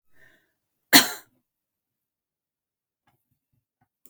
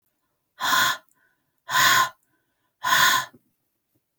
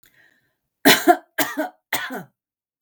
{
  "cough_length": "4.1 s",
  "cough_amplitude": 32768,
  "cough_signal_mean_std_ratio": 0.14,
  "exhalation_length": "4.2 s",
  "exhalation_amplitude": 16907,
  "exhalation_signal_mean_std_ratio": 0.43,
  "three_cough_length": "2.8 s",
  "three_cough_amplitude": 32768,
  "three_cough_signal_mean_std_ratio": 0.33,
  "survey_phase": "beta (2021-08-13 to 2022-03-07)",
  "age": "65+",
  "gender": "Female",
  "wearing_mask": "No",
  "symptom_none": true,
  "smoker_status": "Never smoked",
  "respiratory_condition_asthma": false,
  "respiratory_condition_other": false,
  "recruitment_source": "REACT",
  "submission_delay": "1 day",
  "covid_test_result": "Negative",
  "covid_test_method": "RT-qPCR",
  "influenza_a_test_result": "Negative",
  "influenza_b_test_result": "Negative"
}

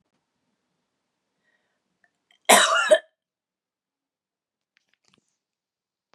{
  "cough_length": "6.1 s",
  "cough_amplitude": 31194,
  "cough_signal_mean_std_ratio": 0.21,
  "survey_phase": "beta (2021-08-13 to 2022-03-07)",
  "age": "65+",
  "gender": "Female",
  "wearing_mask": "No",
  "symptom_none": true,
  "smoker_status": "Ex-smoker",
  "respiratory_condition_asthma": false,
  "respiratory_condition_other": false,
  "recruitment_source": "REACT",
  "submission_delay": "3 days",
  "covid_test_result": "Negative",
  "covid_test_method": "RT-qPCR",
  "influenza_a_test_result": "Negative",
  "influenza_b_test_result": "Negative"
}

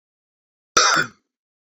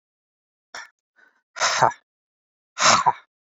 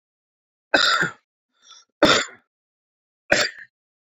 {
  "cough_length": "1.7 s",
  "cough_amplitude": 31989,
  "cough_signal_mean_std_ratio": 0.33,
  "exhalation_length": "3.6 s",
  "exhalation_amplitude": 27843,
  "exhalation_signal_mean_std_ratio": 0.32,
  "three_cough_length": "4.2 s",
  "three_cough_amplitude": 28687,
  "three_cough_signal_mean_std_ratio": 0.33,
  "survey_phase": "beta (2021-08-13 to 2022-03-07)",
  "age": "45-64",
  "gender": "Male",
  "wearing_mask": "No",
  "symptom_none": true,
  "smoker_status": "Ex-smoker",
  "respiratory_condition_asthma": false,
  "respiratory_condition_other": false,
  "recruitment_source": "REACT",
  "submission_delay": "1 day",
  "covid_test_result": "Negative",
  "covid_test_method": "RT-qPCR"
}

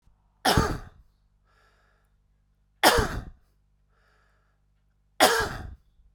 {
  "three_cough_length": "6.1 s",
  "three_cough_amplitude": 22722,
  "three_cough_signal_mean_std_ratio": 0.31,
  "survey_phase": "beta (2021-08-13 to 2022-03-07)",
  "age": "45-64",
  "gender": "Male",
  "wearing_mask": "No",
  "symptom_cough_any": true,
  "symptom_onset": "5 days",
  "smoker_status": "Current smoker (11 or more cigarettes per day)",
  "respiratory_condition_asthma": false,
  "respiratory_condition_other": false,
  "recruitment_source": "REACT",
  "submission_delay": "1 day",
  "covid_test_result": "Negative",
  "covid_test_method": "RT-qPCR"
}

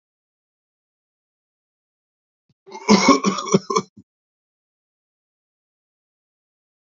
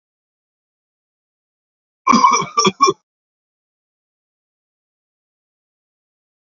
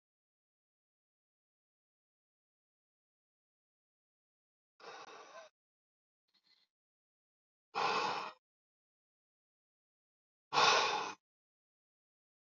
{
  "cough_length": "7.0 s",
  "cough_amplitude": 29219,
  "cough_signal_mean_std_ratio": 0.23,
  "three_cough_length": "6.5 s",
  "three_cough_amplitude": 29853,
  "three_cough_signal_mean_std_ratio": 0.24,
  "exhalation_length": "12.5 s",
  "exhalation_amplitude": 5071,
  "exhalation_signal_mean_std_ratio": 0.23,
  "survey_phase": "beta (2021-08-13 to 2022-03-07)",
  "age": "65+",
  "gender": "Male",
  "wearing_mask": "No",
  "symptom_none": true,
  "smoker_status": "Current smoker (e-cigarettes or vapes only)",
  "respiratory_condition_asthma": false,
  "respiratory_condition_other": false,
  "recruitment_source": "REACT",
  "submission_delay": "1 day",
  "covid_test_result": "Negative",
  "covid_test_method": "RT-qPCR",
  "influenza_a_test_result": "Negative",
  "influenza_b_test_result": "Negative"
}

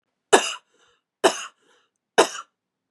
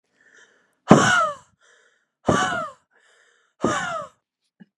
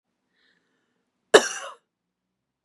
{
  "three_cough_length": "2.9 s",
  "three_cough_amplitude": 31214,
  "three_cough_signal_mean_std_ratio": 0.26,
  "exhalation_length": "4.8 s",
  "exhalation_amplitude": 32768,
  "exhalation_signal_mean_std_ratio": 0.35,
  "cough_length": "2.6 s",
  "cough_amplitude": 32538,
  "cough_signal_mean_std_ratio": 0.16,
  "survey_phase": "beta (2021-08-13 to 2022-03-07)",
  "age": "18-44",
  "gender": "Female",
  "wearing_mask": "No",
  "symptom_none": true,
  "smoker_status": "Never smoked",
  "respiratory_condition_asthma": false,
  "respiratory_condition_other": false,
  "recruitment_source": "REACT",
  "submission_delay": "0 days",
  "covid_test_result": "Negative",
  "covid_test_method": "RT-qPCR",
  "influenza_a_test_result": "Negative",
  "influenza_b_test_result": "Negative"
}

